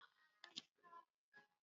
{
  "exhalation_length": "1.6 s",
  "exhalation_amplitude": 748,
  "exhalation_signal_mean_std_ratio": 0.35,
  "survey_phase": "beta (2021-08-13 to 2022-03-07)",
  "age": "65+",
  "gender": "Female",
  "wearing_mask": "No",
  "symptom_cough_any": true,
  "symptom_shortness_of_breath": true,
  "symptom_fatigue": true,
  "symptom_fever_high_temperature": true,
  "symptom_loss_of_taste": true,
  "symptom_onset": "5 days",
  "smoker_status": "Ex-smoker",
  "respiratory_condition_asthma": true,
  "respiratory_condition_other": false,
  "recruitment_source": "Test and Trace",
  "submission_delay": "1 day",
  "covid_test_result": "Positive",
  "covid_test_method": "RT-qPCR"
}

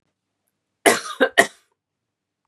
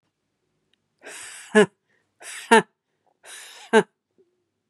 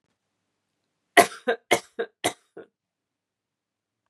{
  "cough_length": "2.5 s",
  "cough_amplitude": 32768,
  "cough_signal_mean_std_ratio": 0.26,
  "exhalation_length": "4.7 s",
  "exhalation_amplitude": 32767,
  "exhalation_signal_mean_std_ratio": 0.23,
  "three_cough_length": "4.1 s",
  "three_cough_amplitude": 32767,
  "three_cough_signal_mean_std_ratio": 0.2,
  "survey_phase": "beta (2021-08-13 to 2022-03-07)",
  "age": "18-44",
  "gender": "Female",
  "wearing_mask": "No",
  "symptom_fatigue": true,
  "symptom_onset": "2 days",
  "smoker_status": "Current smoker (1 to 10 cigarettes per day)",
  "respiratory_condition_asthma": false,
  "respiratory_condition_other": false,
  "recruitment_source": "Test and Trace",
  "submission_delay": "2 days",
  "covid_test_result": "Positive",
  "covid_test_method": "ePCR"
}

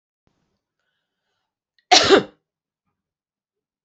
{
  "cough_length": "3.8 s",
  "cough_amplitude": 30614,
  "cough_signal_mean_std_ratio": 0.21,
  "survey_phase": "beta (2021-08-13 to 2022-03-07)",
  "age": "45-64",
  "gender": "Female",
  "wearing_mask": "No",
  "symptom_none": true,
  "smoker_status": "Never smoked",
  "respiratory_condition_asthma": false,
  "respiratory_condition_other": false,
  "recruitment_source": "REACT",
  "submission_delay": "2 days",
  "covid_test_result": "Negative",
  "covid_test_method": "RT-qPCR"
}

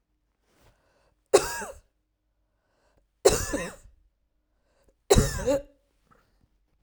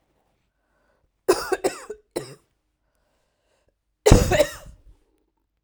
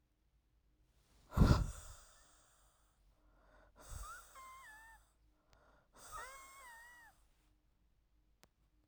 {
  "three_cough_length": "6.8 s",
  "three_cough_amplitude": 22572,
  "three_cough_signal_mean_std_ratio": 0.27,
  "cough_length": "5.6 s",
  "cough_amplitude": 32768,
  "cough_signal_mean_std_ratio": 0.26,
  "exhalation_length": "8.9 s",
  "exhalation_amplitude": 5857,
  "exhalation_signal_mean_std_ratio": 0.22,
  "survey_phase": "beta (2021-08-13 to 2022-03-07)",
  "age": "18-44",
  "gender": "Female",
  "wearing_mask": "No",
  "symptom_runny_or_blocked_nose": true,
  "symptom_sore_throat": true,
  "symptom_abdominal_pain": true,
  "symptom_diarrhoea": true,
  "symptom_fatigue": true,
  "symptom_headache": true,
  "symptom_onset": "2 days",
  "smoker_status": "Never smoked",
  "respiratory_condition_asthma": false,
  "respiratory_condition_other": false,
  "recruitment_source": "Test and Trace",
  "submission_delay": "2 days",
  "covid_test_result": "Positive",
  "covid_test_method": "ePCR"
}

